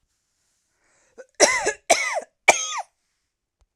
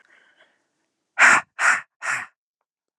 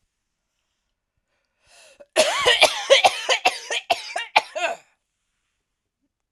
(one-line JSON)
{"three_cough_length": "3.8 s", "three_cough_amplitude": 32768, "three_cough_signal_mean_std_ratio": 0.33, "exhalation_length": "3.0 s", "exhalation_amplitude": 29626, "exhalation_signal_mean_std_ratio": 0.33, "cough_length": "6.3 s", "cough_amplitude": 32768, "cough_signal_mean_std_ratio": 0.36, "survey_phase": "alpha (2021-03-01 to 2021-08-12)", "age": "18-44", "gender": "Female", "wearing_mask": "No", "symptom_none": true, "symptom_onset": "13 days", "smoker_status": "Prefer not to say", "respiratory_condition_asthma": false, "respiratory_condition_other": false, "recruitment_source": "REACT", "submission_delay": "1 day", "covid_test_result": "Negative", "covid_test_method": "RT-qPCR"}